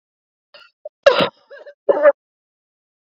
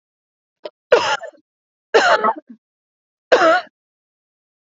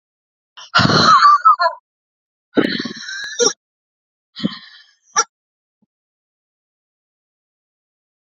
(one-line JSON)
{"cough_length": "3.2 s", "cough_amplitude": 29009, "cough_signal_mean_std_ratio": 0.28, "three_cough_length": "4.6 s", "three_cough_amplitude": 32627, "three_cough_signal_mean_std_ratio": 0.36, "exhalation_length": "8.3 s", "exhalation_amplitude": 30404, "exhalation_signal_mean_std_ratio": 0.34, "survey_phase": "beta (2021-08-13 to 2022-03-07)", "age": "18-44", "gender": "Female", "wearing_mask": "No", "symptom_runny_or_blocked_nose": true, "symptom_sore_throat": true, "smoker_status": "Never smoked", "respiratory_condition_asthma": false, "respiratory_condition_other": false, "recruitment_source": "Test and Trace", "submission_delay": "2 days", "covid_test_result": "Positive", "covid_test_method": "LFT"}